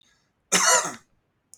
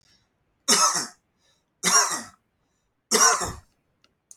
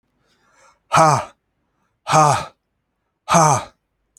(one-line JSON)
{"cough_length": "1.6 s", "cough_amplitude": 16383, "cough_signal_mean_std_ratio": 0.39, "three_cough_length": "4.4 s", "three_cough_amplitude": 19275, "three_cough_signal_mean_std_ratio": 0.39, "exhalation_length": "4.2 s", "exhalation_amplitude": 30563, "exhalation_signal_mean_std_ratio": 0.38, "survey_phase": "beta (2021-08-13 to 2022-03-07)", "age": "45-64", "gender": "Male", "wearing_mask": "No", "symptom_none": true, "smoker_status": "Never smoked", "respiratory_condition_asthma": false, "respiratory_condition_other": false, "recruitment_source": "REACT", "submission_delay": "1 day", "covid_test_result": "Negative", "covid_test_method": "RT-qPCR"}